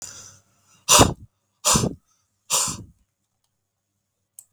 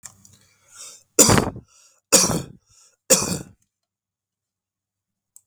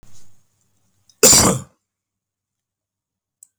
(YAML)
exhalation_length: 4.5 s
exhalation_amplitude: 32768
exhalation_signal_mean_std_ratio: 0.3
three_cough_length: 5.5 s
three_cough_amplitude: 32768
three_cough_signal_mean_std_ratio: 0.29
cough_length: 3.6 s
cough_amplitude: 32768
cough_signal_mean_std_ratio: 0.27
survey_phase: beta (2021-08-13 to 2022-03-07)
age: 65+
gender: Male
wearing_mask: 'No'
symptom_none: true
smoker_status: Ex-smoker
respiratory_condition_asthma: false
respiratory_condition_other: false
recruitment_source: REACT
submission_delay: 2 days
covid_test_result: Negative
covid_test_method: RT-qPCR
influenza_a_test_result: Negative
influenza_b_test_result: Negative